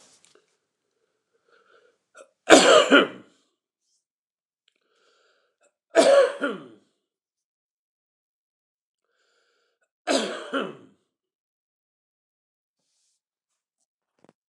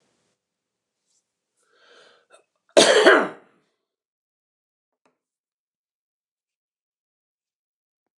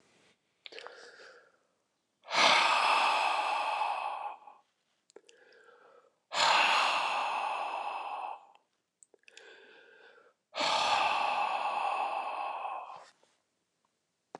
{
  "three_cough_length": "14.5 s",
  "three_cough_amplitude": 29204,
  "three_cough_signal_mean_std_ratio": 0.23,
  "cough_length": "8.2 s",
  "cough_amplitude": 29203,
  "cough_signal_mean_std_ratio": 0.19,
  "exhalation_length": "14.4 s",
  "exhalation_amplitude": 10312,
  "exhalation_signal_mean_std_ratio": 0.56,
  "survey_phase": "beta (2021-08-13 to 2022-03-07)",
  "age": "65+",
  "gender": "Male",
  "wearing_mask": "No",
  "symptom_cough_any": true,
  "symptom_abdominal_pain": true,
  "symptom_onset": "7 days",
  "smoker_status": "Ex-smoker",
  "respiratory_condition_asthma": true,
  "respiratory_condition_other": false,
  "recruitment_source": "REACT",
  "submission_delay": "2 days",
  "covid_test_result": "Negative",
  "covid_test_method": "RT-qPCR",
  "influenza_a_test_result": "Negative",
  "influenza_b_test_result": "Negative"
}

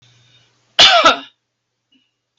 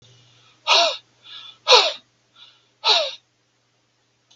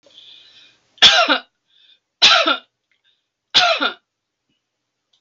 {
  "cough_length": "2.4 s",
  "cough_amplitude": 32768,
  "cough_signal_mean_std_ratio": 0.33,
  "exhalation_length": "4.4 s",
  "exhalation_amplitude": 32768,
  "exhalation_signal_mean_std_ratio": 0.33,
  "three_cough_length": "5.2 s",
  "three_cough_amplitude": 32768,
  "three_cough_signal_mean_std_ratio": 0.35,
  "survey_phase": "beta (2021-08-13 to 2022-03-07)",
  "age": "65+",
  "gender": "Female",
  "wearing_mask": "No",
  "symptom_none": true,
  "smoker_status": "Never smoked",
  "respiratory_condition_asthma": false,
  "respiratory_condition_other": false,
  "recruitment_source": "REACT",
  "submission_delay": "2 days",
  "covid_test_result": "Negative",
  "covid_test_method": "RT-qPCR",
  "influenza_a_test_result": "Negative",
  "influenza_b_test_result": "Negative"
}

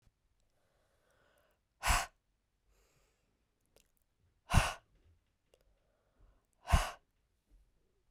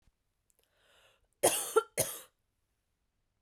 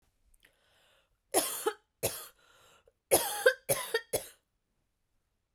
{
  "exhalation_length": "8.1 s",
  "exhalation_amplitude": 7544,
  "exhalation_signal_mean_std_ratio": 0.2,
  "cough_length": "3.4 s",
  "cough_amplitude": 7602,
  "cough_signal_mean_std_ratio": 0.26,
  "three_cough_length": "5.5 s",
  "three_cough_amplitude": 11974,
  "three_cough_signal_mean_std_ratio": 0.32,
  "survey_phase": "beta (2021-08-13 to 2022-03-07)",
  "age": "18-44",
  "gender": "Female",
  "wearing_mask": "No",
  "symptom_cough_any": true,
  "symptom_runny_or_blocked_nose": true,
  "symptom_shortness_of_breath": true,
  "symptom_fatigue": true,
  "symptom_headache": true,
  "symptom_change_to_sense_of_smell_or_taste": true,
  "symptom_loss_of_taste": true,
  "symptom_onset": "2 days",
  "smoker_status": "Ex-smoker",
  "respiratory_condition_asthma": false,
  "respiratory_condition_other": false,
  "recruitment_source": "Test and Trace",
  "submission_delay": "1 day",
  "covid_test_result": "Positive",
  "covid_test_method": "RT-qPCR",
  "covid_ct_value": 20.7,
  "covid_ct_gene": "S gene",
  "covid_ct_mean": 21.4,
  "covid_viral_load": "97000 copies/ml",
  "covid_viral_load_category": "Low viral load (10K-1M copies/ml)"
}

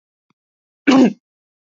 {
  "cough_length": "1.8 s",
  "cough_amplitude": 27146,
  "cough_signal_mean_std_ratio": 0.31,
  "survey_phase": "beta (2021-08-13 to 2022-03-07)",
  "age": "18-44",
  "gender": "Male",
  "wearing_mask": "No",
  "symptom_none": true,
  "smoker_status": "Never smoked",
  "respiratory_condition_asthma": true,
  "respiratory_condition_other": false,
  "recruitment_source": "REACT",
  "submission_delay": "3 days",
  "covid_test_result": "Negative",
  "covid_test_method": "RT-qPCR",
  "influenza_a_test_result": "Negative",
  "influenza_b_test_result": "Negative"
}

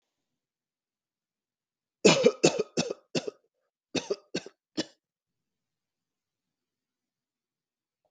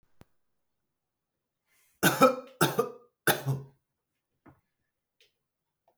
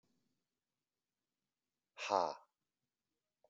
{
  "cough_length": "8.1 s",
  "cough_amplitude": 16911,
  "cough_signal_mean_std_ratio": 0.22,
  "three_cough_length": "6.0 s",
  "three_cough_amplitude": 15539,
  "three_cough_signal_mean_std_ratio": 0.26,
  "exhalation_length": "3.5 s",
  "exhalation_amplitude": 3365,
  "exhalation_signal_mean_std_ratio": 0.19,
  "survey_phase": "beta (2021-08-13 to 2022-03-07)",
  "age": "18-44",
  "gender": "Male",
  "wearing_mask": "No",
  "symptom_none": true,
  "smoker_status": "Never smoked",
  "respiratory_condition_asthma": false,
  "respiratory_condition_other": false,
  "recruitment_source": "REACT",
  "submission_delay": "0 days",
  "covid_test_result": "Negative",
  "covid_test_method": "RT-qPCR",
  "influenza_a_test_result": "Negative",
  "influenza_b_test_result": "Negative"
}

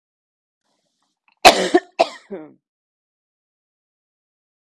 {
  "cough_length": "4.8 s",
  "cough_amplitude": 32768,
  "cough_signal_mean_std_ratio": 0.19,
  "survey_phase": "beta (2021-08-13 to 2022-03-07)",
  "age": "45-64",
  "gender": "Female",
  "wearing_mask": "No",
  "symptom_cough_any": true,
  "symptom_new_continuous_cough": true,
  "symptom_runny_or_blocked_nose": true,
  "symptom_sore_throat": true,
  "symptom_onset": "7 days",
  "smoker_status": "Ex-smoker",
  "respiratory_condition_asthma": false,
  "respiratory_condition_other": false,
  "recruitment_source": "Test and Trace",
  "submission_delay": "2 days",
  "covid_test_result": "Positive",
  "covid_test_method": "RT-qPCR",
  "covid_ct_value": 24.1,
  "covid_ct_gene": "N gene"
}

